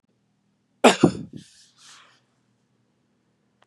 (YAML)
cough_length: 3.7 s
cough_amplitude: 30140
cough_signal_mean_std_ratio: 0.19
survey_phase: beta (2021-08-13 to 2022-03-07)
age: 45-64
gender: Male
wearing_mask: 'No'
symptom_other: true
symptom_onset: 3 days
smoker_status: Ex-smoker
respiratory_condition_asthma: false
respiratory_condition_other: false
recruitment_source: REACT
submission_delay: 1 day
covid_test_result: Negative
covid_test_method: RT-qPCR
influenza_a_test_result: Negative
influenza_b_test_result: Negative